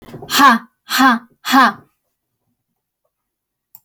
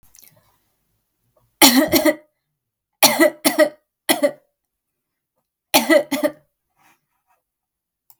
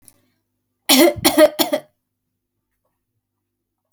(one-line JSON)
{"exhalation_length": "3.8 s", "exhalation_amplitude": 32202, "exhalation_signal_mean_std_ratio": 0.37, "cough_length": "8.2 s", "cough_amplitude": 32768, "cough_signal_mean_std_ratio": 0.33, "three_cough_length": "3.9 s", "three_cough_amplitude": 32768, "three_cough_signal_mean_std_ratio": 0.31, "survey_phase": "alpha (2021-03-01 to 2021-08-12)", "age": "18-44", "gender": "Female", "wearing_mask": "No", "symptom_none": true, "smoker_status": "Never smoked", "respiratory_condition_asthma": false, "respiratory_condition_other": false, "recruitment_source": "REACT", "submission_delay": "2 days", "covid_test_result": "Negative", "covid_test_method": "RT-qPCR"}